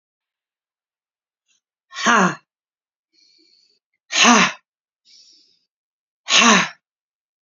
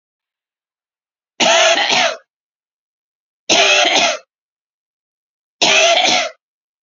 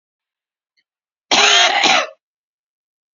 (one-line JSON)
{"exhalation_length": "7.4 s", "exhalation_amplitude": 32767, "exhalation_signal_mean_std_ratio": 0.3, "three_cough_length": "6.8 s", "three_cough_amplitude": 32767, "three_cough_signal_mean_std_ratio": 0.47, "cough_length": "3.2 s", "cough_amplitude": 32480, "cough_signal_mean_std_ratio": 0.4, "survey_phase": "beta (2021-08-13 to 2022-03-07)", "age": "45-64", "gender": "Female", "wearing_mask": "No", "symptom_none": true, "smoker_status": "Ex-smoker", "respiratory_condition_asthma": false, "respiratory_condition_other": false, "recruitment_source": "REACT", "submission_delay": "0 days", "covid_test_result": "Negative", "covid_test_method": "RT-qPCR", "influenza_a_test_result": "Negative", "influenza_b_test_result": "Negative"}